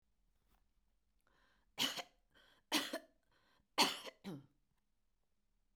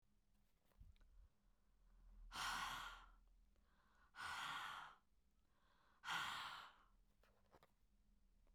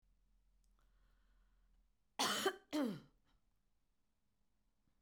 {"three_cough_length": "5.8 s", "three_cough_amplitude": 3656, "three_cough_signal_mean_std_ratio": 0.27, "exhalation_length": "8.5 s", "exhalation_amplitude": 570, "exhalation_signal_mean_std_ratio": 0.5, "cough_length": "5.0 s", "cough_amplitude": 2184, "cough_signal_mean_std_ratio": 0.3, "survey_phase": "beta (2021-08-13 to 2022-03-07)", "age": "65+", "gender": "Female", "wearing_mask": "No", "symptom_none": true, "smoker_status": "Ex-smoker", "respiratory_condition_asthma": false, "respiratory_condition_other": false, "recruitment_source": "REACT", "submission_delay": "2 days", "covid_test_result": "Negative", "covid_test_method": "RT-qPCR"}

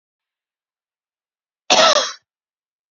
{"cough_length": "2.9 s", "cough_amplitude": 32286, "cough_signal_mean_std_ratio": 0.28, "survey_phase": "beta (2021-08-13 to 2022-03-07)", "age": "18-44", "gender": "Female", "wearing_mask": "No", "symptom_sore_throat": true, "symptom_onset": "3 days", "smoker_status": "Ex-smoker", "respiratory_condition_asthma": false, "respiratory_condition_other": false, "recruitment_source": "Test and Trace", "submission_delay": "2 days", "covid_test_result": "Negative", "covid_test_method": "RT-qPCR"}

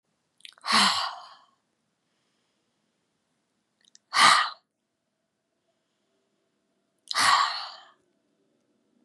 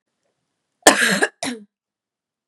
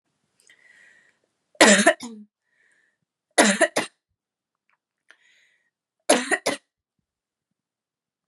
{"exhalation_length": "9.0 s", "exhalation_amplitude": 20621, "exhalation_signal_mean_std_ratio": 0.29, "cough_length": "2.5 s", "cough_amplitude": 32768, "cough_signal_mean_std_ratio": 0.31, "three_cough_length": "8.3 s", "three_cough_amplitude": 32191, "three_cough_signal_mean_std_ratio": 0.25, "survey_phase": "beta (2021-08-13 to 2022-03-07)", "age": "18-44", "gender": "Female", "wearing_mask": "No", "symptom_runny_or_blocked_nose": true, "symptom_sore_throat": true, "symptom_other": true, "symptom_onset": "6 days", "smoker_status": "Never smoked", "respiratory_condition_asthma": false, "respiratory_condition_other": false, "recruitment_source": "Test and Trace", "submission_delay": "1 day", "covid_test_result": "Positive", "covid_test_method": "RT-qPCR", "covid_ct_value": 18.7, "covid_ct_gene": "ORF1ab gene", "covid_ct_mean": 18.9, "covid_viral_load": "620000 copies/ml", "covid_viral_load_category": "Low viral load (10K-1M copies/ml)"}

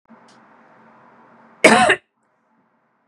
{"cough_length": "3.1 s", "cough_amplitude": 32768, "cough_signal_mean_std_ratio": 0.27, "survey_phase": "beta (2021-08-13 to 2022-03-07)", "age": "45-64", "gender": "Female", "wearing_mask": "No", "symptom_none": true, "symptom_onset": "12 days", "smoker_status": "Never smoked", "respiratory_condition_asthma": true, "respiratory_condition_other": false, "recruitment_source": "REACT", "submission_delay": "6 days", "covid_test_result": "Negative", "covid_test_method": "RT-qPCR", "influenza_a_test_result": "Negative", "influenza_b_test_result": "Negative"}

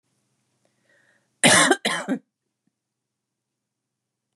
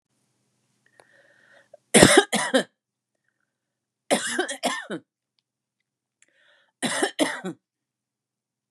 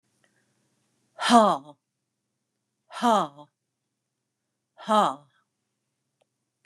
{"cough_length": "4.4 s", "cough_amplitude": 27440, "cough_signal_mean_std_ratio": 0.27, "three_cough_length": "8.7 s", "three_cough_amplitude": 32767, "three_cough_signal_mean_std_ratio": 0.28, "exhalation_length": "6.7 s", "exhalation_amplitude": 24202, "exhalation_signal_mean_std_ratio": 0.26, "survey_phase": "beta (2021-08-13 to 2022-03-07)", "age": "45-64", "gender": "Female", "wearing_mask": "No", "symptom_fatigue": true, "symptom_headache": true, "smoker_status": "Never smoked", "respiratory_condition_asthma": true, "respiratory_condition_other": false, "recruitment_source": "REACT", "submission_delay": "2 days", "covid_test_result": "Negative", "covid_test_method": "RT-qPCR", "influenza_a_test_result": "Negative", "influenza_b_test_result": "Negative"}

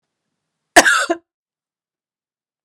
{"cough_length": "2.6 s", "cough_amplitude": 32768, "cough_signal_mean_std_ratio": 0.25, "survey_phase": "beta (2021-08-13 to 2022-03-07)", "age": "18-44", "gender": "Female", "wearing_mask": "No", "symptom_cough_any": true, "symptom_runny_or_blocked_nose": true, "symptom_fatigue": true, "symptom_headache": true, "symptom_change_to_sense_of_smell_or_taste": true, "symptom_loss_of_taste": true, "symptom_onset": "3 days", "smoker_status": "Never smoked", "respiratory_condition_asthma": false, "respiratory_condition_other": false, "recruitment_source": "Test and Trace", "submission_delay": "2 days", "covid_test_result": "Positive", "covid_test_method": "RT-qPCR", "covid_ct_value": 18.0, "covid_ct_gene": "N gene", "covid_ct_mean": 19.6, "covid_viral_load": "370000 copies/ml", "covid_viral_load_category": "Low viral load (10K-1M copies/ml)"}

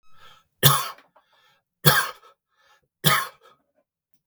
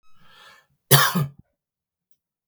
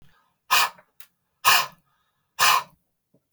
{"three_cough_length": "4.3 s", "three_cough_amplitude": 32768, "three_cough_signal_mean_std_ratio": 0.3, "cough_length": "2.5 s", "cough_amplitude": 32768, "cough_signal_mean_std_ratio": 0.28, "exhalation_length": "3.3 s", "exhalation_amplitude": 22005, "exhalation_signal_mean_std_ratio": 0.34, "survey_phase": "beta (2021-08-13 to 2022-03-07)", "age": "45-64", "gender": "Male", "wearing_mask": "No", "symptom_none": true, "smoker_status": "Never smoked", "respiratory_condition_asthma": false, "respiratory_condition_other": false, "recruitment_source": "REACT", "submission_delay": "1 day", "covid_test_result": "Negative", "covid_test_method": "RT-qPCR", "influenza_a_test_result": "Negative", "influenza_b_test_result": "Negative"}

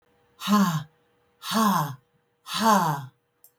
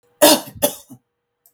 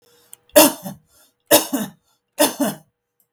{"exhalation_length": "3.6 s", "exhalation_amplitude": 12400, "exhalation_signal_mean_std_ratio": 0.53, "cough_length": "1.5 s", "cough_amplitude": 32768, "cough_signal_mean_std_ratio": 0.33, "three_cough_length": "3.3 s", "three_cough_amplitude": 32768, "three_cough_signal_mean_std_ratio": 0.34, "survey_phase": "beta (2021-08-13 to 2022-03-07)", "age": "65+", "gender": "Female", "wearing_mask": "No", "symptom_none": true, "smoker_status": "Never smoked", "respiratory_condition_asthma": false, "respiratory_condition_other": false, "recruitment_source": "REACT", "submission_delay": "2 days", "covid_test_result": "Negative", "covid_test_method": "RT-qPCR", "influenza_a_test_result": "Negative", "influenza_b_test_result": "Negative"}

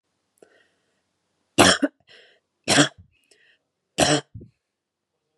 {"three_cough_length": "5.4 s", "three_cough_amplitude": 30038, "three_cough_signal_mean_std_ratio": 0.27, "survey_phase": "beta (2021-08-13 to 2022-03-07)", "age": "18-44", "gender": "Female", "wearing_mask": "No", "symptom_none": true, "smoker_status": "Never smoked", "respiratory_condition_asthma": false, "respiratory_condition_other": false, "recruitment_source": "REACT", "submission_delay": "2 days", "covid_test_result": "Negative", "covid_test_method": "RT-qPCR", "influenza_a_test_result": "Negative", "influenza_b_test_result": "Negative"}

